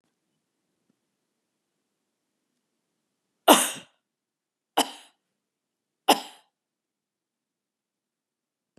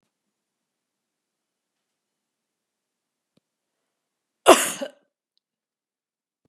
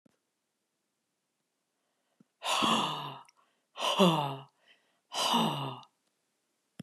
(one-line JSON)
{"three_cough_length": "8.8 s", "three_cough_amplitude": 28021, "three_cough_signal_mean_std_ratio": 0.15, "cough_length": "6.5 s", "cough_amplitude": 32768, "cough_signal_mean_std_ratio": 0.13, "exhalation_length": "6.8 s", "exhalation_amplitude": 10172, "exhalation_signal_mean_std_ratio": 0.4, "survey_phase": "beta (2021-08-13 to 2022-03-07)", "age": "65+", "gender": "Female", "wearing_mask": "No", "symptom_sore_throat": true, "symptom_onset": "12 days", "smoker_status": "Never smoked", "respiratory_condition_asthma": false, "respiratory_condition_other": false, "recruitment_source": "REACT", "submission_delay": "1 day", "covid_test_result": "Negative", "covid_test_method": "RT-qPCR"}